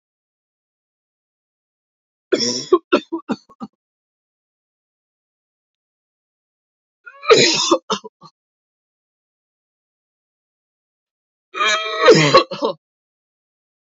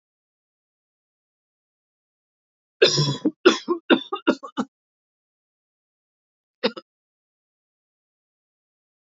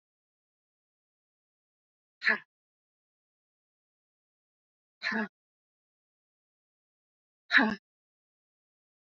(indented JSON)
{
  "three_cough_length": "14.0 s",
  "three_cough_amplitude": 29204,
  "three_cough_signal_mean_std_ratio": 0.28,
  "cough_length": "9.0 s",
  "cough_amplitude": 27669,
  "cough_signal_mean_std_ratio": 0.23,
  "exhalation_length": "9.1 s",
  "exhalation_amplitude": 13340,
  "exhalation_signal_mean_std_ratio": 0.18,
  "survey_phase": "beta (2021-08-13 to 2022-03-07)",
  "age": "45-64",
  "gender": "Female",
  "wearing_mask": "No",
  "symptom_cough_any": true,
  "symptom_fatigue": true,
  "symptom_loss_of_taste": true,
  "symptom_other": true,
  "symptom_onset": "10 days",
  "smoker_status": "Never smoked",
  "respiratory_condition_asthma": false,
  "respiratory_condition_other": false,
  "recruitment_source": "Test and Trace",
  "submission_delay": "2 days",
  "covid_test_result": "Positive",
  "covid_test_method": "ePCR"
}